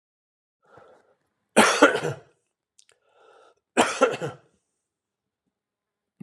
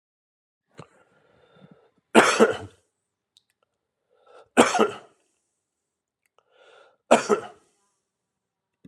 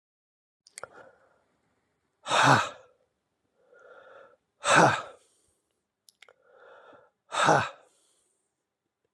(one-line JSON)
{"cough_length": "6.2 s", "cough_amplitude": 31373, "cough_signal_mean_std_ratio": 0.27, "three_cough_length": "8.9 s", "three_cough_amplitude": 30111, "three_cough_signal_mean_std_ratio": 0.23, "exhalation_length": "9.1 s", "exhalation_amplitude": 19294, "exhalation_signal_mean_std_ratio": 0.27, "survey_phase": "alpha (2021-03-01 to 2021-08-12)", "age": "65+", "gender": "Male", "wearing_mask": "No", "symptom_none": true, "smoker_status": "Ex-smoker", "respiratory_condition_asthma": true, "respiratory_condition_other": false, "recruitment_source": "REACT", "submission_delay": "2 days", "covid_test_method": "RT-qPCR"}